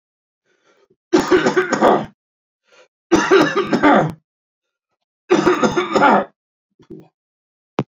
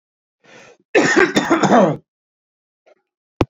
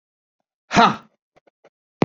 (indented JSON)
{
  "three_cough_length": "7.9 s",
  "three_cough_amplitude": 28805,
  "three_cough_signal_mean_std_ratio": 0.47,
  "cough_length": "3.5 s",
  "cough_amplitude": 27188,
  "cough_signal_mean_std_ratio": 0.43,
  "exhalation_length": "2.0 s",
  "exhalation_amplitude": 29583,
  "exhalation_signal_mean_std_ratio": 0.25,
  "survey_phase": "beta (2021-08-13 to 2022-03-07)",
  "age": "45-64",
  "gender": "Male",
  "wearing_mask": "No",
  "symptom_none": true,
  "symptom_onset": "6 days",
  "smoker_status": "Never smoked",
  "respiratory_condition_asthma": false,
  "respiratory_condition_other": false,
  "recruitment_source": "Test and Trace",
  "submission_delay": "2 days",
  "covid_test_result": "Negative",
  "covid_test_method": "ePCR"
}